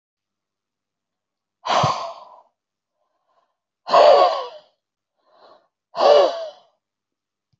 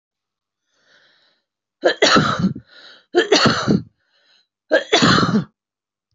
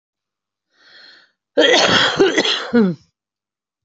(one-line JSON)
{"exhalation_length": "7.6 s", "exhalation_amplitude": 24394, "exhalation_signal_mean_std_ratio": 0.33, "three_cough_length": "6.1 s", "three_cough_amplitude": 27083, "three_cough_signal_mean_std_ratio": 0.44, "cough_length": "3.8 s", "cough_amplitude": 29080, "cough_signal_mean_std_ratio": 0.48, "survey_phase": "beta (2021-08-13 to 2022-03-07)", "age": "45-64", "gender": "Female", "wearing_mask": "No", "symptom_none": true, "smoker_status": "Current smoker (11 or more cigarettes per day)", "respiratory_condition_asthma": false, "respiratory_condition_other": false, "recruitment_source": "REACT", "submission_delay": "1 day", "covid_test_result": "Negative", "covid_test_method": "RT-qPCR"}